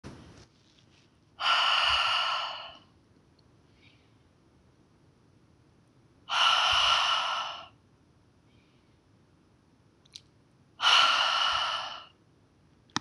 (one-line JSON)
{"exhalation_length": "13.0 s", "exhalation_amplitude": 12811, "exhalation_signal_mean_std_ratio": 0.45, "survey_phase": "beta (2021-08-13 to 2022-03-07)", "age": "45-64", "gender": "Female", "wearing_mask": "No", "symptom_none": true, "smoker_status": "Never smoked", "respiratory_condition_asthma": false, "respiratory_condition_other": false, "recruitment_source": "REACT", "submission_delay": "2 days", "covid_test_result": "Negative", "covid_test_method": "RT-qPCR", "influenza_a_test_result": "Negative", "influenza_b_test_result": "Negative"}